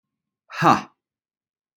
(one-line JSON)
{"exhalation_length": "1.8 s", "exhalation_amplitude": 26613, "exhalation_signal_mean_std_ratio": 0.26, "survey_phase": "alpha (2021-03-01 to 2021-08-12)", "age": "18-44", "gender": "Male", "wearing_mask": "No", "symptom_none": true, "smoker_status": "Never smoked", "respiratory_condition_asthma": false, "respiratory_condition_other": false, "recruitment_source": "REACT", "submission_delay": "1 day", "covid_test_result": "Negative", "covid_test_method": "RT-qPCR", "covid_ct_value": 42.0, "covid_ct_gene": "E gene"}